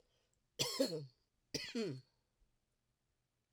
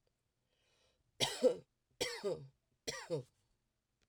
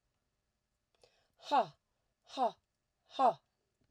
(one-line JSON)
{"cough_length": "3.5 s", "cough_amplitude": 2562, "cough_signal_mean_std_ratio": 0.37, "three_cough_length": "4.1 s", "three_cough_amplitude": 3487, "three_cough_signal_mean_std_ratio": 0.33, "exhalation_length": "3.9 s", "exhalation_amplitude": 4116, "exhalation_signal_mean_std_ratio": 0.28, "survey_phase": "alpha (2021-03-01 to 2021-08-12)", "age": "45-64", "gender": "Female", "wearing_mask": "No", "symptom_none": true, "smoker_status": "Never smoked", "respiratory_condition_asthma": false, "respiratory_condition_other": false, "recruitment_source": "REACT", "submission_delay": "1 day", "covid_test_result": "Negative", "covid_test_method": "RT-qPCR"}